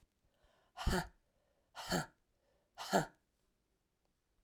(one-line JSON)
{"exhalation_length": "4.4 s", "exhalation_amplitude": 4282, "exhalation_signal_mean_std_ratio": 0.29, "survey_phase": "alpha (2021-03-01 to 2021-08-12)", "age": "65+", "gender": "Female", "wearing_mask": "No", "symptom_cough_any": true, "symptom_new_continuous_cough": true, "symptom_fatigue": true, "symptom_headache": true, "symptom_change_to_sense_of_smell_or_taste": true, "symptom_loss_of_taste": true, "smoker_status": "Never smoked", "respiratory_condition_asthma": false, "respiratory_condition_other": false, "recruitment_source": "Test and Trace", "submission_delay": "2 days", "covid_test_result": "Positive", "covid_test_method": "RT-qPCR"}